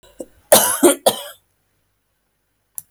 {"cough_length": "2.9 s", "cough_amplitude": 32768, "cough_signal_mean_std_ratio": 0.31, "survey_phase": "alpha (2021-03-01 to 2021-08-12)", "age": "18-44", "gender": "Female", "wearing_mask": "No", "symptom_none": true, "smoker_status": "Never smoked", "respiratory_condition_asthma": false, "respiratory_condition_other": false, "recruitment_source": "REACT", "submission_delay": "2 days", "covid_test_result": "Negative", "covid_test_method": "RT-qPCR"}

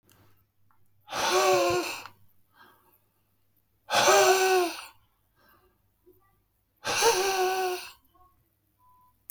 {"exhalation_length": "9.3 s", "exhalation_amplitude": 13139, "exhalation_signal_mean_std_ratio": 0.45, "survey_phase": "beta (2021-08-13 to 2022-03-07)", "age": "45-64", "gender": "Male", "wearing_mask": "No", "symptom_none": true, "smoker_status": "Never smoked", "respiratory_condition_asthma": false, "respiratory_condition_other": false, "recruitment_source": "REACT", "submission_delay": "1 day", "covid_test_result": "Negative", "covid_test_method": "RT-qPCR", "influenza_a_test_result": "Negative", "influenza_b_test_result": "Negative"}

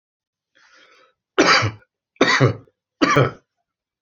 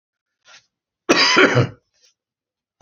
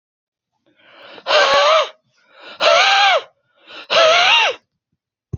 {"three_cough_length": "4.0 s", "three_cough_amplitude": 27699, "three_cough_signal_mean_std_ratio": 0.39, "cough_length": "2.8 s", "cough_amplitude": 28903, "cough_signal_mean_std_ratio": 0.37, "exhalation_length": "5.4 s", "exhalation_amplitude": 28618, "exhalation_signal_mean_std_ratio": 0.53, "survey_phase": "beta (2021-08-13 to 2022-03-07)", "age": "65+", "gender": "Male", "wearing_mask": "No", "symptom_runny_or_blocked_nose": true, "symptom_sore_throat": true, "symptom_headache": true, "smoker_status": "Never smoked", "respiratory_condition_asthma": false, "respiratory_condition_other": false, "recruitment_source": "Test and Trace", "submission_delay": "1 day", "covid_test_result": "Positive", "covid_test_method": "RT-qPCR", "covid_ct_value": 18.6, "covid_ct_gene": "N gene", "covid_ct_mean": 19.3, "covid_viral_load": "480000 copies/ml", "covid_viral_load_category": "Low viral load (10K-1M copies/ml)"}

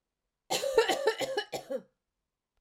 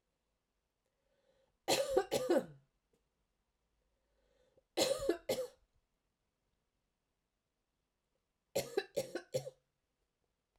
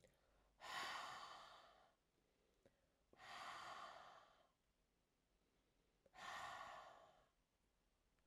{"cough_length": "2.6 s", "cough_amplitude": 9112, "cough_signal_mean_std_ratio": 0.48, "three_cough_length": "10.6 s", "three_cough_amplitude": 4544, "three_cough_signal_mean_std_ratio": 0.3, "exhalation_length": "8.3 s", "exhalation_amplitude": 373, "exhalation_signal_mean_std_ratio": 0.53, "survey_phase": "beta (2021-08-13 to 2022-03-07)", "age": "45-64", "gender": "Female", "wearing_mask": "No", "symptom_none": true, "smoker_status": "Never smoked", "respiratory_condition_asthma": false, "respiratory_condition_other": false, "recruitment_source": "Test and Trace", "submission_delay": "2 days", "covid_test_result": "Negative", "covid_test_method": "RT-qPCR"}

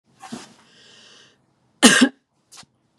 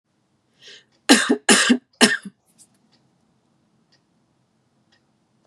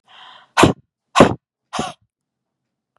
{"cough_length": "3.0 s", "cough_amplitude": 32767, "cough_signal_mean_std_ratio": 0.25, "three_cough_length": "5.5 s", "three_cough_amplitude": 32767, "three_cough_signal_mean_std_ratio": 0.27, "exhalation_length": "3.0 s", "exhalation_amplitude": 32768, "exhalation_signal_mean_std_ratio": 0.27, "survey_phase": "beta (2021-08-13 to 2022-03-07)", "age": "18-44", "gender": "Female", "wearing_mask": "No", "symptom_none": true, "smoker_status": "Never smoked", "respiratory_condition_asthma": false, "respiratory_condition_other": false, "recruitment_source": "REACT", "submission_delay": "4 days", "covid_test_result": "Negative", "covid_test_method": "RT-qPCR", "influenza_a_test_result": "Negative", "influenza_b_test_result": "Negative"}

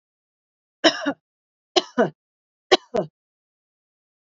{"three_cough_length": "4.3 s", "three_cough_amplitude": 29242, "three_cough_signal_mean_std_ratio": 0.24, "survey_phase": "beta (2021-08-13 to 2022-03-07)", "age": "45-64", "gender": "Female", "wearing_mask": "No", "symptom_none": true, "smoker_status": "Never smoked", "respiratory_condition_asthma": false, "respiratory_condition_other": false, "recruitment_source": "REACT", "submission_delay": "2 days", "covid_test_result": "Negative", "covid_test_method": "RT-qPCR", "influenza_a_test_result": "Negative", "influenza_b_test_result": "Negative"}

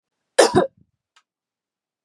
{"cough_length": "2.0 s", "cough_amplitude": 32112, "cough_signal_mean_std_ratio": 0.25, "survey_phase": "beta (2021-08-13 to 2022-03-07)", "age": "45-64", "gender": "Female", "wearing_mask": "No", "symptom_none": true, "smoker_status": "Never smoked", "respiratory_condition_asthma": false, "respiratory_condition_other": false, "recruitment_source": "REACT", "submission_delay": "0 days", "covid_test_result": "Negative", "covid_test_method": "RT-qPCR", "influenza_a_test_result": "Negative", "influenza_b_test_result": "Negative"}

